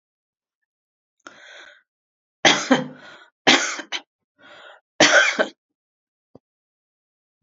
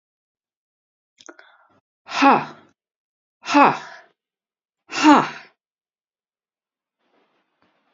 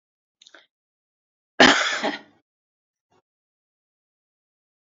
three_cough_length: 7.4 s
three_cough_amplitude: 30764
three_cough_signal_mean_std_ratio: 0.29
exhalation_length: 7.9 s
exhalation_amplitude: 28070
exhalation_signal_mean_std_ratio: 0.25
cough_length: 4.9 s
cough_amplitude: 30749
cough_signal_mean_std_ratio: 0.21
survey_phase: beta (2021-08-13 to 2022-03-07)
age: 65+
gender: Female
wearing_mask: 'No'
symptom_none: true
smoker_status: Ex-smoker
respiratory_condition_asthma: false
respiratory_condition_other: false
recruitment_source: REACT
submission_delay: 2 days
covid_test_result: Negative
covid_test_method: RT-qPCR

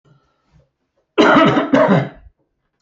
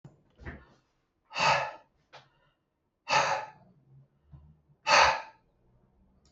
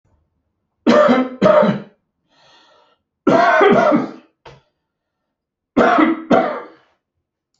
cough_length: 2.8 s
cough_amplitude: 27779
cough_signal_mean_std_ratio: 0.47
exhalation_length: 6.3 s
exhalation_amplitude: 14405
exhalation_signal_mean_std_ratio: 0.32
three_cough_length: 7.6 s
three_cough_amplitude: 30174
three_cough_signal_mean_std_ratio: 0.47
survey_phase: alpha (2021-03-01 to 2021-08-12)
age: 65+
gender: Male
wearing_mask: 'No'
symptom_none: true
smoker_status: Never smoked
respiratory_condition_asthma: false
respiratory_condition_other: false
recruitment_source: REACT
submission_delay: 1 day
covid_test_result: Negative
covid_test_method: RT-qPCR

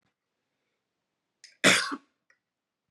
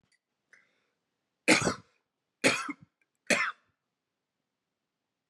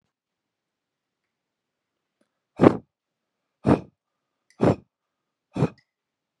cough_length: 2.9 s
cough_amplitude: 19137
cough_signal_mean_std_ratio: 0.23
three_cough_length: 5.3 s
three_cough_amplitude: 15022
three_cough_signal_mean_std_ratio: 0.26
exhalation_length: 6.4 s
exhalation_amplitude: 31534
exhalation_signal_mean_std_ratio: 0.2
survey_phase: beta (2021-08-13 to 2022-03-07)
age: 18-44
gender: Male
wearing_mask: 'No'
symptom_cough_any: true
smoker_status: Never smoked
respiratory_condition_asthma: false
respiratory_condition_other: false
recruitment_source: REACT
submission_delay: 1 day
covid_test_result: Negative
covid_test_method: RT-qPCR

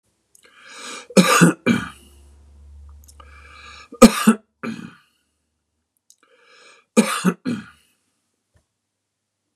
three_cough_length: 9.6 s
three_cough_amplitude: 32768
three_cough_signal_mean_std_ratio: 0.27
survey_phase: beta (2021-08-13 to 2022-03-07)
age: 45-64
gender: Male
wearing_mask: 'No'
symptom_none: true
smoker_status: Ex-smoker
respiratory_condition_asthma: false
respiratory_condition_other: false
recruitment_source: REACT
submission_delay: -1 day
covid_test_result: Negative
covid_test_method: RT-qPCR
influenza_a_test_result: Unknown/Void
influenza_b_test_result: Unknown/Void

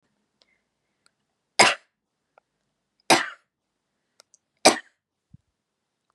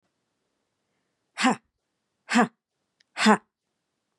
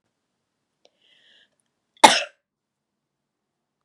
three_cough_length: 6.1 s
three_cough_amplitude: 30135
three_cough_signal_mean_std_ratio: 0.18
exhalation_length: 4.2 s
exhalation_amplitude: 23203
exhalation_signal_mean_std_ratio: 0.26
cough_length: 3.8 s
cough_amplitude: 32768
cough_signal_mean_std_ratio: 0.14
survey_phase: beta (2021-08-13 to 2022-03-07)
age: 45-64
gender: Female
wearing_mask: 'No'
symptom_cough_any: true
symptom_runny_or_blocked_nose: true
symptom_sore_throat: true
symptom_fatigue: true
symptom_headache: true
smoker_status: Ex-smoker
respiratory_condition_asthma: false
respiratory_condition_other: false
recruitment_source: Test and Trace
submission_delay: 1 day
covid_test_result: Positive
covid_test_method: RT-qPCR
covid_ct_value: 20.3
covid_ct_gene: ORF1ab gene
covid_ct_mean: 20.7
covid_viral_load: 160000 copies/ml
covid_viral_load_category: Low viral load (10K-1M copies/ml)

